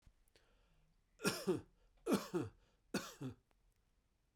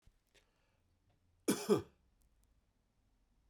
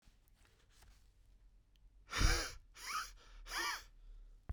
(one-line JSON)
{"three_cough_length": "4.4 s", "three_cough_amplitude": 3241, "three_cough_signal_mean_std_ratio": 0.36, "cough_length": "3.5 s", "cough_amplitude": 3611, "cough_signal_mean_std_ratio": 0.22, "exhalation_length": "4.5 s", "exhalation_amplitude": 3374, "exhalation_signal_mean_std_ratio": 0.41, "survey_phase": "beta (2021-08-13 to 2022-03-07)", "age": "45-64", "gender": "Male", "wearing_mask": "No", "symptom_cough_any": true, "symptom_runny_or_blocked_nose": true, "symptom_sore_throat": true, "symptom_abdominal_pain": true, "symptom_fatigue": true, "smoker_status": "Ex-smoker", "respiratory_condition_asthma": false, "respiratory_condition_other": false, "recruitment_source": "Test and Trace", "submission_delay": "1 day", "covid_test_result": "Positive", "covid_test_method": "RT-qPCR", "covid_ct_value": 27.4, "covid_ct_gene": "ORF1ab gene"}